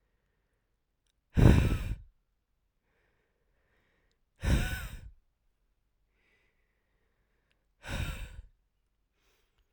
{"exhalation_length": "9.7 s", "exhalation_amplitude": 15329, "exhalation_signal_mean_std_ratio": 0.25, "survey_phase": "alpha (2021-03-01 to 2021-08-12)", "age": "18-44", "gender": "Female", "wearing_mask": "No", "symptom_cough_any": true, "symptom_new_continuous_cough": true, "symptom_shortness_of_breath": true, "symptom_diarrhoea": true, "symptom_fatigue": true, "symptom_fever_high_temperature": true, "symptom_headache": true, "symptom_change_to_sense_of_smell_or_taste": true, "symptom_loss_of_taste": true, "symptom_onset": "3 days", "smoker_status": "Current smoker (1 to 10 cigarettes per day)", "respiratory_condition_asthma": false, "respiratory_condition_other": false, "recruitment_source": "Test and Trace", "submission_delay": "2 days", "covid_test_result": "Positive", "covid_test_method": "RT-qPCR"}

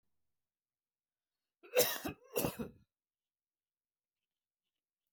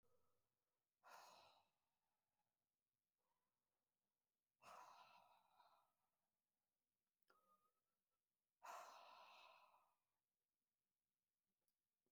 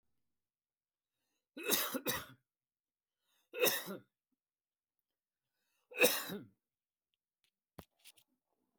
{"cough_length": "5.1 s", "cough_amplitude": 6258, "cough_signal_mean_std_ratio": 0.24, "exhalation_length": "12.1 s", "exhalation_amplitude": 157, "exhalation_signal_mean_std_ratio": 0.37, "three_cough_length": "8.8 s", "three_cough_amplitude": 7355, "three_cough_signal_mean_std_ratio": 0.27, "survey_phase": "beta (2021-08-13 to 2022-03-07)", "age": "18-44", "gender": "Male", "wearing_mask": "No", "symptom_none": true, "smoker_status": "Never smoked", "respiratory_condition_asthma": false, "respiratory_condition_other": false, "recruitment_source": "REACT", "submission_delay": "2 days", "covid_test_result": "Negative", "covid_test_method": "RT-qPCR", "influenza_a_test_result": "Unknown/Void", "influenza_b_test_result": "Unknown/Void"}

